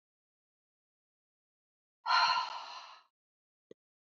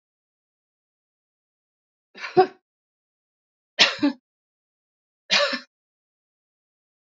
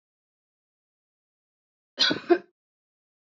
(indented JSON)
{
  "exhalation_length": "4.2 s",
  "exhalation_amplitude": 5402,
  "exhalation_signal_mean_std_ratio": 0.29,
  "three_cough_length": "7.2 s",
  "three_cough_amplitude": 26239,
  "three_cough_signal_mean_std_ratio": 0.22,
  "cough_length": "3.3 s",
  "cough_amplitude": 14928,
  "cough_signal_mean_std_ratio": 0.21,
  "survey_phase": "beta (2021-08-13 to 2022-03-07)",
  "age": "45-64",
  "gender": "Female",
  "wearing_mask": "No",
  "symptom_runny_or_blocked_nose": true,
  "symptom_sore_throat": true,
  "symptom_onset": "4 days",
  "smoker_status": "Never smoked",
  "respiratory_condition_asthma": false,
  "respiratory_condition_other": false,
  "recruitment_source": "Test and Trace",
  "submission_delay": "2 days",
  "covid_test_result": "Negative",
  "covid_test_method": "RT-qPCR"
}